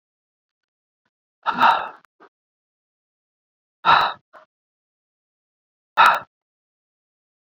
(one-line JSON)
{"exhalation_length": "7.5 s", "exhalation_amplitude": 28993, "exhalation_signal_mean_std_ratio": 0.25, "survey_phase": "beta (2021-08-13 to 2022-03-07)", "age": "45-64", "gender": "Male", "wearing_mask": "No", "symptom_none": true, "smoker_status": "Never smoked", "respiratory_condition_asthma": false, "respiratory_condition_other": false, "recruitment_source": "REACT", "submission_delay": "1 day", "covid_test_result": "Negative", "covid_test_method": "RT-qPCR"}